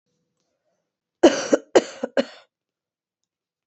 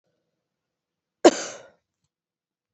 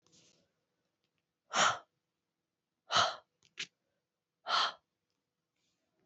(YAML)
three_cough_length: 3.7 s
three_cough_amplitude: 26959
three_cough_signal_mean_std_ratio: 0.23
cough_length: 2.7 s
cough_amplitude: 26876
cough_signal_mean_std_ratio: 0.15
exhalation_length: 6.1 s
exhalation_amplitude: 5717
exhalation_signal_mean_std_ratio: 0.27
survey_phase: beta (2021-08-13 to 2022-03-07)
age: 18-44
gender: Female
wearing_mask: 'No'
symptom_cough_any: true
symptom_sore_throat: true
symptom_fatigue: true
symptom_onset: 4 days
smoker_status: Never smoked
respiratory_condition_asthma: false
respiratory_condition_other: false
recruitment_source: Test and Trace
submission_delay: 1 day
covid_test_result: Positive
covid_test_method: RT-qPCR
covid_ct_value: 23.5
covid_ct_gene: N gene